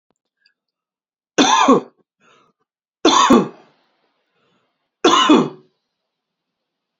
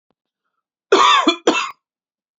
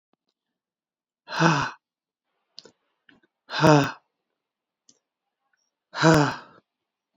three_cough_length: 7.0 s
three_cough_amplitude: 31184
three_cough_signal_mean_std_ratio: 0.35
cough_length: 2.4 s
cough_amplitude: 28305
cough_signal_mean_std_ratio: 0.41
exhalation_length: 7.2 s
exhalation_amplitude: 24863
exhalation_signal_mean_std_ratio: 0.29
survey_phase: beta (2021-08-13 to 2022-03-07)
age: 45-64
gender: Female
wearing_mask: 'No'
symptom_runny_or_blocked_nose: true
symptom_fatigue: true
symptom_onset: 5 days
smoker_status: Ex-smoker
respiratory_condition_asthma: false
respiratory_condition_other: false
recruitment_source: REACT
submission_delay: 1 day
covid_test_result: Negative
covid_test_method: RT-qPCR
influenza_a_test_result: Unknown/Void
influenza_b_test_result: Unknown/Void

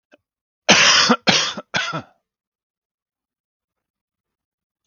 cough_length: 4.9 s
cough_amplitude: 31028
cough_signal_mean_std_ratio: 0.34
survey_phase: beta (2021-08-13 to 2022-03-07)
age: 18-44
gender: Male
wearing_mask: 'No'
symptom_none: true
smoker_status: Never smoked
respiratory_condition_asthma: false
respiratory_condition_other: false
recruitment_source: REACT
submission_delay: 3 days
covid_test_result: Negative
covid_test_method: RT-qPCR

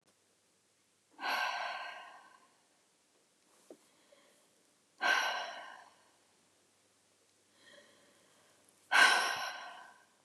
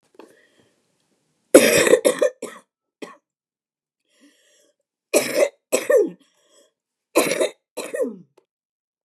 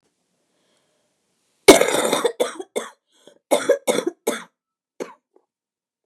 exhalation_length: 10.2 s
exhalation_amplitude: 7702
exhalation_signal_mean_std_ratio: 0.32
three_cough_length: 9.0 s
three_cough_amplitude: 32768
three_cough_signal_mean_std_ratio: 0.33
cough_length: 6.1 s
cough_amplitude: 32768
cough_signal_mean_std_ratio: 0.3
survey_phase: beta (2021-08-13 to 2022-03-07)
age: 65+
gender: Male
wearing_mask: 'No'
symptom_new_continuous_cough: true
symptom_runny_or_blocked_nose: true
symptom_shortness_of_breath: true
symptom_sore_throat: true
symptom_abdominal_pain: true
symptom_fatigue: true
symptom_headache: true
smoker_status: Never smoked
respiratory_condition_asthma: false
respiratory_condition_other: false
recruitment_source: Test and Trace
submission_delay: 1 day
covid_test_result: Negative
covid_test_method: RT-qPCR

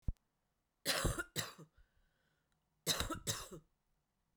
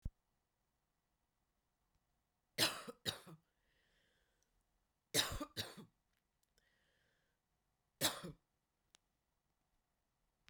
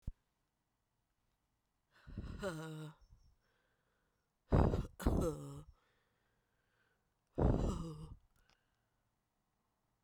cough_length: 4.4 s
cough_amplitude: 2940
cough_signal_mean_std_ratio: 0.38
three_cough_length: 10.5 s
three_cough_amplitude: 2896
three_cough_signal_mean_std_ratio: 0.23
exhalation_length: 10.0 s
exhalation_amplitude: 5011
exhalation_signal_mean_std_ratio: 0.33
survey_phase: beta (2021-08-13 to 2022-03-07)
age: 45-64
gender: Female
wearing_mask: 'No'
symptom_cough_any: true
symptom_runny_or_blocked_nose: true
symptom_fatigue: true
symptom_headache: true
symptom_change_to_sense_of_smell_or_taste: true
symptom_other: true
symptom_onset: 4 days
smoker_status: Current smoker (1 to 10 cigarettes per day)
respiratory_condition_asthma: false
respiratory_condition_other: false
recruitment_source: Test and Trace
submission_delay: 1 day
covid_test_result: Positive
covid_test_method: RT-qPCR
covid_ct_value: 12.3
covid_ct_gene: ORF1ab gene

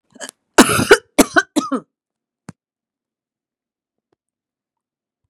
cough_length: 5.3 s
cough_amplitude: 32768
cough_signal_mean_std_ratio: 0.24
survey_phase: beta (2021-08-13 to 2022-03-07)
age: 65+
gender: Female
wearing_mask: 'No'
symptom_none: true
smoker_status: Ex-smoker
respiratory_condition_asthma: false
respiratory_condition_other: false
recruitment_source: REACT
submission_delay: 2 days
covid_test_result: Negative
covid_test_method: RT-qPCR
influenza_a_test_result: Negative
influenza_b_test_result: Negative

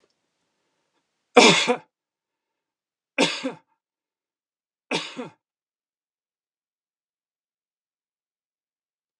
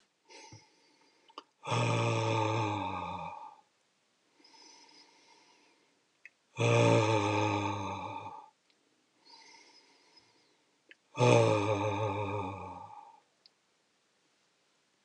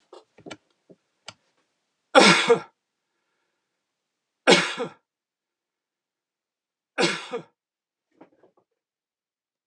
cough_length: 9.2 s
cough_amplitude: 32646
cough_signal_mean_std_ratio: 0.2
exhalation_length: 15.0 s
exhalation_amplitude: 10066
exhalation_signal_mean_std_ratio: 0.46
three_cough_length: 9.7 s
three_cough_amplitude: 29150
three_cough_signal_mean_std_ratio: 0.23
survey_phase: alpha (2021-03-01 to 2021-08-12)
age: 65+
gender: Male
wearing_mask: 'No'
symptom_none: true
smoker_status: Never smoked
respiratory_condition_asthma: false
respiratory_condition_other: false
recruitment_source: REACT
submission_delay: 2 days
covid_test_result: Negative
covid_test_method: RT-qPCR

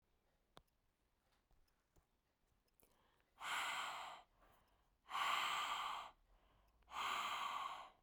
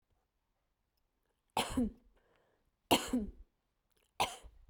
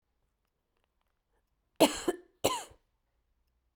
exhalation_length: 8.0 s
exhalation_amplitude: 1470
exhalation_signal_mean_std_ratio: 0.51
three_cough_length: 4.7 s
three_cough_amplitude: 6124
three_cough_signal_mean_std_ratio: 0.31
cough_length: 3.8 s
cough_amplitude: 12567
cough_signal_mean_std_ratio: 0.22
survey_phase: beta (2021-08-13 to 2022-03-07)
age: 18-44
gender: Female
wearing_mask: 'No'
symptom_sore_throat: true
smoker_status: Never smoked
respiratory_condition_asthma: false
respiratory_condition_other: false
recruitment_source: REACT
submission_delay: 6 days
covid_test_result: Negative
covid_test_method: RT-qPCR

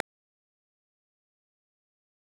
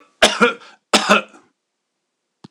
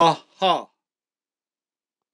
cough_length: 2.2 s
cough_amplitude: 6575
cough_signal_mean_std_ratio: 0.02
three_cough_length: 2.5 s
three_cough_amplitude: 26028
three_cough_signal_mean_std_ratio: 0.35
exhalation_length: 2.1 s
exhalation_amplitude: 22053
exhalation_signal_mean_std_ratio: 0.3
survey_phase: alpha (2021-03-01 to 2021-08-12)
age: 65+
gender: Male
wearing_mask: 'No'
symptom_none: true
smoker_status: Ex-smoker
respiratory_condition_asthma: false
respiratory_condition_other: false
recruitment_source: REACT
submission_delay: 2 days
covid_test_result: Negative
covid_test_method: RT-qPCR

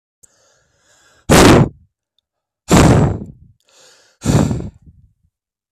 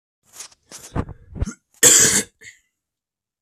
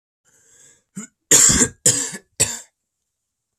exhalation_length: 5.7 s
exhalation_amplitude: 32768
exhalation_signal_mean_std_ratio: 0.39
cough_length: 3.4 s
cough_amplitude: 32768
cough_signal_mean_std_ratio: 0.32
three_cough_length: 3.6 s
three_cough_amplitude: 32768
three_cough_signal_mean_std_ratio: 0.35
survey_phase: beta (2021-08-13 to 2022-03-07)
age: 18-44
gender: Male
wearing_mask: 'No'
symptom_cough_any: true
symptom_runny_or_blocked_nose: true
symptom_sore_throat: true
symptom_headache: true
smoker_status: Never smoked
respiratory_condition_asthma: true
respiratory_condition_other: false
recruitment_source: Test and Trace
submission_delay: 1 day
covid_test_result: Positive
covid_test_method: RT-qPCR
covid_ct_value: 17.1
covid_ct_gene: ORF1ab gene
covid_ct_mean: 17.4
covid_viral_load: 1900000 copies/ml
covid_viral_load_category: High viral load (>1M copies/ml)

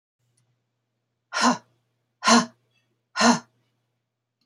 exhalation_length: 4.5 s
exhalation_amplitude: 19602
exhalation_signal_mean_std_ratio: 0.29
survey_phase: beta (2021-08-13 to 2022-03-07)
age: 45-64
gender: Female
wearing_mask: 'No'
symptom_none: true
smoker_status: Never smoked
respiratory_condition_asthma: false
respiratory_condition_other: false
recruitment_source: REACT
submission_delay: 1 day
covid_test_result: Negative
covid_test_method: RT-qPCR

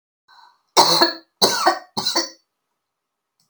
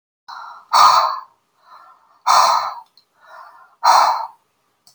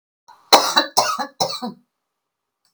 three_cough_length: 3.5 s
three_cough_amplitude: 32768
three_cough_signal_mean_std_ratio: 0.4
exhalation_length: 4.9 s
exhalation_amplitude: 32006
exhalation_signal_mean_std_ratio: 0.43
cough_length: 2.7 s
cough_amplitude: 32629
cough_signal_mean_std_ratio: 0.37
survey_phase: alpha (2021-03-01 to 2021-08-12)
age: 65+
gender: Female
wearing_mask: 'No'
symptom_none: true
smoker_status: Never smoked
respiratory_condition_asthma: false
respiratory_condition_other: false
recruitment_source: REACT
submission_delay: 1 day
covid_test_result: Negative
covid_test_method: RT-qPCR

